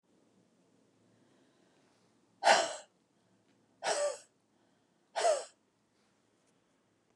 exhalation_length: 7.2 s
exhalation_amplitude: 9636
exhalation_signal_mean_std_ratio: 0.27
survey_phase: beta (2021-08-13 to 2022-03-07)
age: 65+
gender: Female
wearing_mask: 'No'
symptom_none: true
smoker_status: Never smoked
respiratory_condition_asthma: false
respiratory_condition_other: false
recruitment_source: REACT
submission_delay: 2 days
covid_test_result: Negative
covid_test_method: RT-qPCR
influenza_a_test_result: Negative
influenza_b_test_result: Negative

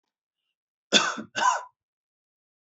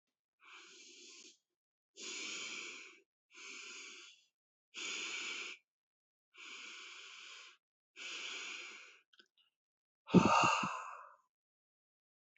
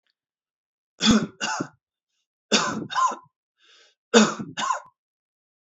cough_length: 2.6 s
cough_amplitude: 23192
cough_signal_mean_std_ratio: 0.32
exhalation_length: 12.4 s
exhalation_amplitude: 7262
exhalation_signal_mean_std_ratio: 0.32
three_cough_length: 5.6 s
three_cough_amplitude: 27101
three_cough_signal_mean_std_ratio: 0.37
survey_phase: beta (2021-08-13 to 2022-03-07)
age: 45-64
gender: Male
wearing_mask: 'No'
symptom_none: true
smoker_status: Never smoked
respiratory_condition_asthma: false
respiratory_condition_other: false
recruitment_source: REACT
submission_delay: 2 days
covid_test_result: Negative
covid_test_method: RT-qPCR
influenza_a_test_result: Negative
influenza_b_test_result: Negative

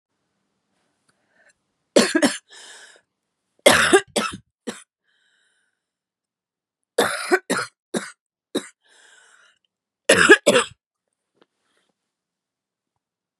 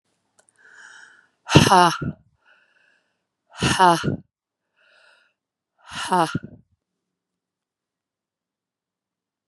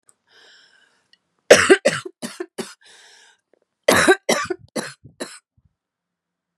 three_cough_length: 13.4 s
three_cough_amplitude: 32768
three_cough_signal_mean_std_ratio: 0.27
exhalation_length: 9.5 s
exhalation_amplitude: 32768
exhalation_signal_mean_std_ratio: 0.26
cough_length: 6.6 s
cough_amplitude: 32768
cough_signal_mean_std_ratio: 0.28
survey_phase: beta (2021-08-13 to 2022-03-07)
age: 18-44
gender: Female
wearing_mask: 'No'
symptom_cough_any: true
symptom_new_continuous_cough: true
symptom_runny_or_blocked_nose: true
symptom_sore_throat: true
symptom_abdominal_pain: true
symptom_fatigue: true
symptom_fever_high_temperature: true
symptom_headache: true
symptom_change_to_sense_of_smell_or_taste: true
symptom_onset: 5 days
smoker_status: Never smoked
respiratory_condition_asthma: false
respiratory_condition_other: false
recruitment_source: Test and Trace
submission_delay: 2 days
covid_test_result: Positive
covid_test_method: RT-qPCR
covid_ct_value: 25.7
covid_ct_gene: ORF1ab gene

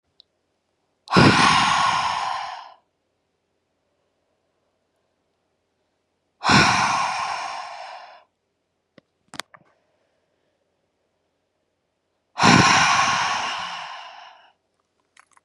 exhalation_length: 15.4 s
exhalation_amplitude: 30660
exhalation_signal_mean_std_ratio: 0.39
survey_phase: beta (2021-08-13 to 2022-03-07)
age: 18-44
gender: Female
wearing_mask: 'No'
symptom_cough_any: true
symptom_runny_or_blocked_nose: true
symptom_shortness_of_breath: true
symptom_sore_throat: true
symptom_fatigue: true
symptom_onset: 3 days
smoker_status: Never smoked
respiratory_condition_asthma: false
respiratory_condition_other: false
recruitment_source: Test and Trace
submission_delay: 2 days
covid_test_result: Positive
covid_test_method: RT-qPCR
covid_ct_value: 18.9
covid_ct_gene: ORF1ab gene
covid_ct_mean: 19.4
covid_viral_load: 440000 copies/ml
covid_viral_load_category: Low viral load (10K-1M copies/ml)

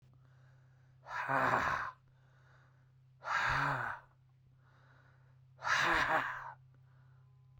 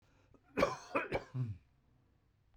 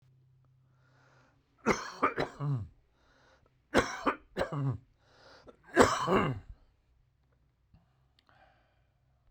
exhalation_length: 7.6 s
exhalation_amplitude: 5433
exhalation_signal_mean_std_ratio: 0.49
cough_length: 2.6 s
cough_amplitude: 5662
cough_signal_mean_std_ratio: 0.4
three_cough_length: 9.3 s
three_cough_amplitude: 18352
three_cough_signal_mean_std_ratio: 0.34
survey_phase: beta (2021-08-13 to 2022-03-07)
age: 65+
gender: Male
wearing_mask: 'No'
symptom_none: true
smoker_status: Ex-smoker
respiratory_condition_asthma: false
respiratory_condition_other: false
recruitment_source: REACT
submission_delay: 2 days
covid_test_result: Negative
covid_test_method: RT-qPCR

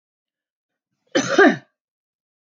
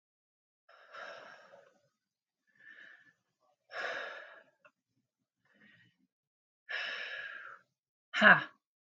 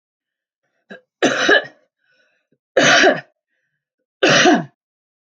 cough_length: 2.5 s
cough_amplitude: 26903
cough_signal_mean_std_ratio: 0.28
exhalation_length: 9.0 s
exhalation_amplitude: 13573
exhalation_signal_mean_std_ratio: 0.21
three_cough_length: 5.3 s
three_cough_amplitude: 31898
three_cough_signal_mean_std_ratio: 0.39
survey_phase: alpha (2021-03-01 to 2021-08-12)
age: 45-64
gender: Female
wearing_mask: 'No'
symptom_fatigue: true
symptom_headache: true
symptom_onset: 12 days
smoker_status: Never smoked
respiratory_condition_asthma: false
respiratory_condition_other: false
recruitment_source: REACT
submission_delay: 1 day
covid_test_result: Negative
covid_test_method: RT-qPCR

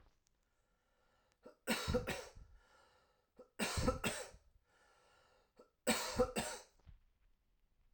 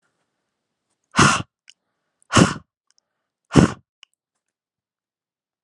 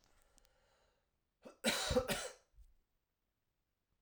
three_cough_length: 7.9 s
three_cough_amplitude: 3373
three_cough_signal_mean_std_ratio: 0.38
exhalation_length: 5.6 s
exhalation_amplitude: 32768
exhalation_signal_mean_std_ratio: 0.23
cough_length: 4.0 s
cough_amplitude: 3004
cough_signal_mean_std_ratio: 0.31
survey_phase: alpha (2021-03-01 to 2021-08-12)
age: 18-44
gender: Male
wearing_mask: 'No'
symptom_none: true
smoker_status: Never smoked
respiratory_condition_asthma: false
respiratory_condition_other: false
recruitment_source: REACT
submission_delay: 3 days
covid_test_result: Negative
covid_test_method: RT-qPCR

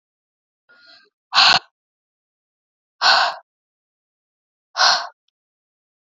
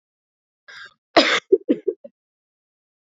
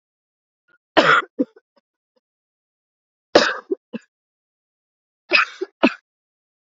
exhalation_length: 6.1 s
exhalation_amplitude: 30900
exhalation_signal_mean_std_ratio: 0.28
cough_length: 3.2 s
cough_amplitude: 26946
cough_signal_mean_std_ratio: 0.26
three_cough_length: 6.7 s
three_cough_amplitude: 29756
three_cough_signal_mean_std_ratio: 0.26
survey_phase: beta (2021-08-13 to 2022-03-07)
age: 18-44
gender: Female
wearing_mask: 'No'
symptom_cough_any: true
symptom_runny_or_blocked_nose: true
symptom_shortness_of_breath: true
symptom_sore_throat: true
symptom_fatigue: true
symptom_headache: true
symptom_change_to_sense_of_smell_or_taste: true
smoker_status: Never smoked
respiratory_condition_asthma: false
respiratory_condition_other: false
recruitment_source: Test and Trace
submission_delay: 2 days
covid_test_result: Positive
covid_test_method: RT-qPCR
covid_ct_value: 22.3
covid_ct_gene: N gene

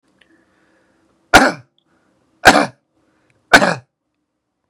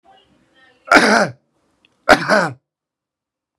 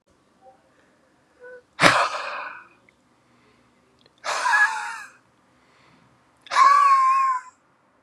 three_cough_length: 4.7 s
three_cough_amplitude: 32768
three_cough_signal_mean_std_ratio: 0.26
cough_length: 3.6 s
cough_amplitude: 32768
cough_signal_mean_std_ratio: 0.33
exhalation_length: 8.0 s
exhalation_amplitude: 32768
exhalation_signal_mean_std_ratio: 0.42
survey_phase: beta (2021-08-13 to 2022-03-07)
age: 18-44
gender: Male
wearing_mask: 'No'
symptom_none: true
smoker_status: Current smoker (1 to 10 cigarettes per day)
respiratory_condition_asthma: false
respiratory_condition_other: false
recruitment_source: REACT
submission_delay: 3 days
covid_test_result: Negative
covid_test_method: RT-qPCR
influenza_a_test_result: Negative
influenza_b_test_result: Negative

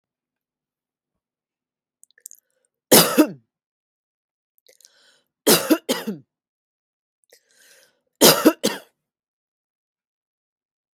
three_cough_length: 11.0 s
three_cough_amplitude: 32768
three_cough_signal_mean_std_ratio: 0.23
survey_phase: beta (2021-08-13 to 2022-03-07)
age: 18-44
gender: Female
wearing_mask: 'No'
symptom_cough_any: true
symptom_runny_or_blocked_nose: true
smoker_status: Never smoked
respiratory_condition_asthma: false
respiratory_condition_other: false
recruitment_source: REACT
submission_delay: 2 days
covid_test_result: Negative
covid_test_method: RT-qPCR
influenza_a_test_result: Negative
influenza_b_test_result: Negative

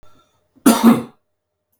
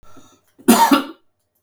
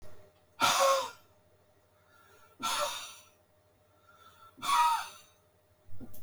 cough_length: 1.8 s
cough_amplitude: 32768
cough_signal_mean_std_ratio: 0.34
three_cough_length: 1.6 s
three_cough_amplitude: 32768
three_cough_signal_mean_std_ratio: 0.39
exhalation_length: 6.2 s
exhalation_amplitude: 6749
exhalation_signal_mean_std_ratio: 0.44
survey_phase: beta (2021-08-13 to 2022-03-07)
age: 45-64
gender: Male
wearing_mask: 'No'
symptom_none: true
symptom_onset: 12 days
smoker_status: Never smoked
respiratory_condition_asthma: false
respiratory_condition_other: false
recruitment_source: REACT
submission_delay: 1 day
covid_test_result: Negative
covid_test_method: RT-qPCR
influenza_a_test_result: Negative
influenza_b_test_result: Negative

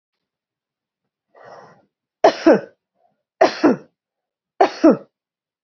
three_cough_length: 5.6 s
three_cough_amplitude: 31919
three_cough_signal_mean_std_ratio: 0.28
survey_phase: beta (2021-08-13 to 2022-03-07)
age: 45-64
gender: Female
wearing_mask: 'No'
symptom_none: true
smoker_status: Ex-smoker
respiratory_condition_asthma: false
respiratory_condition_other: false
recruitment_source: REACT
submission_delay: 1 day
covid_test_result: Negative
covid_test_method: RT-qPCR
influenza_a_test_result: Negative
influenza_b_test_result: Negative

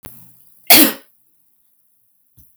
cough_length: 2.6 s
cough_amplitude: 32768
cough_signal_mean_std_ratio: 0.25
survey_phase: alpha (2021-03-01 to 2021-08-12)
age: 65+
gender: Female
wearing_mask: 'No'
symptom_none: true
smoker_status: Ex-smoker
respiratory_condition_asthma: false
respiratory_condition_other: false
recruitment_source: REACT
submission_delay: 2 days
covid_test_result: Negative
covid_test_method: RT-qPCR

